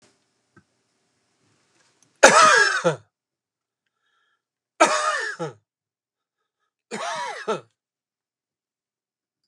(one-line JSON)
{"cough_length": "9.5 s", "cough_amplitude": 32768, "cough_signal_mean_std_ratio": 0.28, "survey_phase": "beta (2021-08-13 to 2022-03-07)", "age": "45-64", "gender": "Male", "wearing_mask": "No", "symptom_cough_any": true, "symptom_onset": "12 days", "smoker_status": "Never smoked", "respiratory_condition_asthma": false, "respiratory_condition_other": false, "recruitment_source": "REACT", "submission_delay": "1 day", "covid_test_result": "Negative", "covid_test_method": "RT-qPCR"}